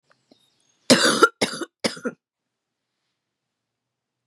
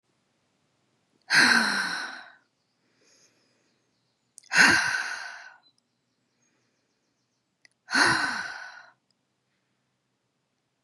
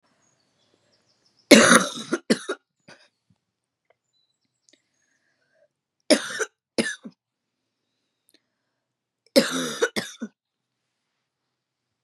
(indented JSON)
{
  "cough_length": "4.3 s",
  "cough_amplitude": 31654,
  "cough_signal_mean_std_ratio": 0.27,
  "exhalation_length": "10.8 s",
  "exhalation_amplitude": 19002,
  "exhalation_signal_mean_std_ratio": 0.33,
  "three_cough_length": "12.0 s",
  "three_cough_amplitude": 32768,
  "three_cough_signal_mean_std_ratio": 0.23,
  "survey_phase": "beta (2021-08-13 to 2022-03-07)",
  "age": "18-44",
  "gender": "Female",
  "wearing_mask": "No",
  "symptom_cough_any": true,
  "symptom_sore_throat": true,
  "symptom_fatigue": true,
  "symptom_fever_high_temperature": true,
  "symptom_headache": true,
  "symptom_other": true,
  "symptom_onset": "4 days",
  "smoker_status": "Never smoked",
  "respiratory_condition_asthma": false,
  "respiratory_condition_other": false,
  "recruitment_source": "Test and Trace",
  "submission_delay": "2 days",
  "covid_test_result": "Positive",
  "covid_test_method": "RT-qPCR",
  "covid_ct_value": 32.6,
  "covid_ct_gene": "N gene"
}